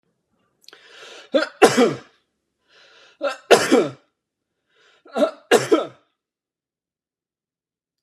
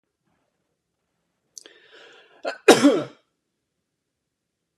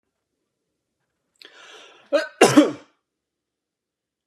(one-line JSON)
{"three_cough_length": "8.0 s", "three_cough_amplitude": 32768, "three_cough_signal_mean_std_ratio": 0.3, "exhalation_length": "4.8 s", "exhalation_amplitude": 32678, "exhalation_signal_mean_std_ratio": 0.2, "cough_length": "4.3 s", "cough_amplitude": 32590, "cough_signal_mean_std_ratio": 0.23, "survey_phase": "beta (2021-08-13 to 2022-03-07)", "age": "45-64", "gender": "Male", "wearing_mask": "No", "symptom_none": true, "smoker_status": "Never smoked", "respiratory_condition_asthma": false, "respiratory_condition_other": false, "recruitment_source": "REACT", "submission_delay": "2 days", "covid_test_result": "Negative", "covid_test_method": "RT-qPCR", "influenza_a_test_result": "Negative", "influenza_b_test_result": "Negative"}